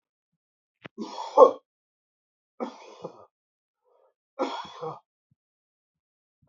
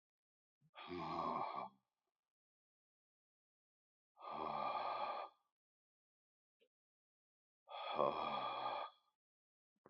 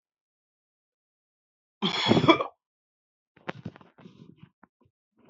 {"three_cough_length": "6.5 s", "three_cough_amplitude": 26060, "three_cough_signal_mean_std_ratio": 0.18, "exhalation_length": "9.9 s", "exhalation_amplitude": 2686, "exhalation_signal_mean_std_ratio": 0.44, "cough_length": "5.3 s", "cough_amplitude": 23068, "cough_signal_mean_std_ratio": 0.24, "survey_phase": "beta (2021-08-13 to 2022-03-07)", "age": "45-64", "gender": "Male", "wearing_mask": "No", "symptom_none": true, "smoker_status": "Current smoker (e-cigarettes or vapes only)", "respiratory_condition_asthma": false, "respiratory_condition_other": false, "recruitment_source": "REACT", "submission_delay": "2 days", "covid_test_result": "Negative", "covid_test_method": "RT-qPCR", "influenza_a_test_result": "Unknown/Void", "influenza_b_test_result": "Unknown/Void"}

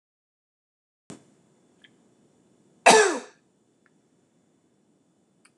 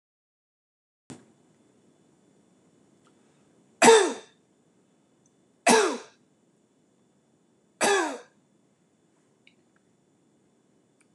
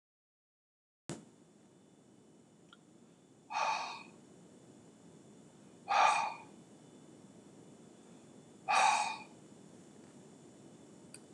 {"cough_length": "5.6 s", "cough_amplitude": 24998, "cough_signal_mean_std_ratio": 0.18, "three_cough_length": "11.1 s", "three_cough_amplitude": 23212, "three_cough_signal_mean_std_ratio": 0.22, "exhalation_length": "11.3 s", "exhalation_amplitude": 5585, "exhalation_signal_mean_std_ratio": 0.34, "survey_phase": "alpha (2021-03-01 to 2021-08-12)", "age": "65+", "gender": "Male", "wearing_mask": "No", "symptom_none": true, "smoker_status": "Never smoked", "respiratory_condition_asthma": false, "respiratory_condition_other": false, "recruitment_source": "REACT", "submission_delay": "1 day", "covid_test_result": "Negative", "covid_test_method": "RT-qPCR"}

